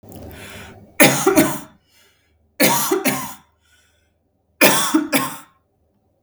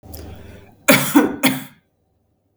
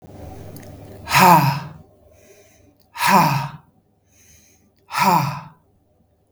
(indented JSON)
{
  "three_cough_length": "6.2 s",
  "three_cough_amplitude": 32768,
  "three_cough_signal_mean_std_ratio": 0.44,
  "cough_length": "2.6 s",
  "cough_amplitude": 32768,
  "cough_signal_mean_std_ratio": 0.4,
  "exhalation_length": "6.3 s",
  "exhalation_amplitude": 32768,
  "exhalation_signal_mean_std_ratio": 0.4,
  "survey_phase": "beta (2021-08-13 to 2022-03-07)",
  "age": "45-64",
  "gender": "Female",
  "wearing_mask": "No",
  "symptom_none": true,
  "smoker_status": "Ex-smoker",
  "respiratory_condition_asthma": false,
  "respiratory_condition_other": false,
  "recruitment_source": "REACT",
  "submission_delay": "0 days",
  "covid_test_result": "Negative",
  "covid_test_method": "RT-qPCR",
  "influenza_a_test_result": "Negative",
  "influenza_b_test_result": "Negative"
}